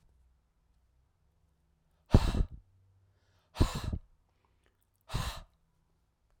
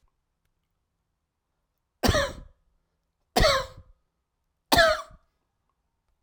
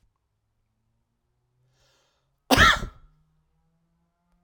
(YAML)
exhalation_length: 6.4 s
exhalation_amplitude: 13764
exhalation_signal_mean_std_ratio: 0.24
three_cough_length: 6.2 s
three_cough_amplitude: 19636
three_cough_signal_mean_std_ratio: 0.29
cough_length: 4.4 s
cough_amplitude: 28642
cough_signal_mean_std_ratio: 0.21
survey_phase: alpha (2021-03-01 to 2021-08-12)
age: 45-64
gender: Male
wearing_mask: 'No'
symptom_none: true
smoker_status: Ex-smoker
respiratory_condition_asthma: false
respiratory_condition_other: false
recruitment_source: REACT
submission_delay: 1 day
covid_test_result: Negative
covid_test_method: RT-qPCR